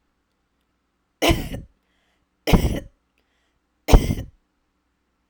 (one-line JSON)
{"three_cough_length": "5.3 s", "three_cough_amplitude": 32768, "three_cough_signal_mean_std_ratio": 0.26, "survey_phase": "alpha (2021-03-01 to 2021-08-12)", "age": "18-44", "gender": "Female", "wearing_mask": "No", "symptom_none": true, "smoker_status": "Never smoked", "respiratory_condition_asthma": false, "respiratory_condition_other": false, "recruitment_source": "REACT", "submission_delay": "2 days", "covid_test_result": "Negative", "covid_test_method": "RT-qPCR"}